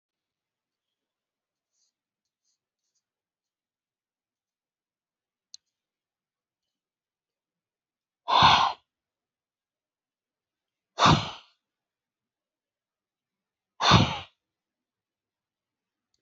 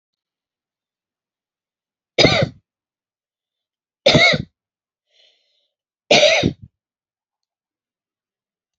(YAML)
exhalation_length: 16.2 s
exhalation_amplitude: 21085
exhalation_signal_mean_std_ratio: 0.19
three_cough_length: 8.8 s
three_cough_amplitude: 32767
three_cough_signal_mean_std_ratio: 0.27
survey_phase: alpha (2021-03-01 to 2021-08-12)
age: 65+
gender: Female
wearing_mask: 'No'
symptom_none: true
smoker_status: Ex-smoker
respiratory_condition_asthma: false
respiratory_condition_other: false
recruitment_source: REACT
submission_delay: 32 days
covid_test_result: Negative
covid_test_method: RT-qPCR